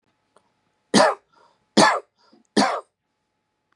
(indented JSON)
{
  "three_cough_length": "3.8 s",
  "three_cough_amplitude": 31120,
  "three_cough_signal_mean_std_ratio": 0.32,
  "survey_phase": "beta (2021-08-13 to 2022-03-07)",
  "age": "45-64",
  "gender": "Male",
  "wearing_mask": "No",
  "symptom_none": true,
  "smoker_status": "Never smoked",
  "respiratory_condition_asthma": false,
  "respiratory_condition_other": false,
  "recruitment_source": "REACT",
  "submission_delay": "1 day",
  "covid_test_result": "Negative",
  "covid_test_method": "RT-qPCR",
  "covid_ct_value": 38.0,
  "covid_ct_gene": "N gene",
  "influenza_a_test_result": "Negative",
  "influenza_b_test_result": "Negative"
}